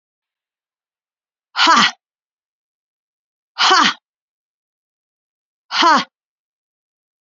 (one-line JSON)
{"exhalation_length": "7.3 s", "exhalation_amplitude": 32768, "exhalation_signal_mean_std_ratio": 0.29, "survey_phase": "beta (2021-08-13 to 2022-03-07)", "age": "45-64", "gender": "Female", "wearing_mask": "No", "symptom_runny_or_blocked_nose": true, "symptom_fatigue": true, "symptom_onset": "4 days", "smoker_status": "Never smoked", "respiratory_condition_asthma": false, "respiratory_condition_other": false, "recruitment_source": "Test and Trace", "submission_delay": "2 days", "covid_test_result": "Positive", "covid_test_method": "RT-qPCR"}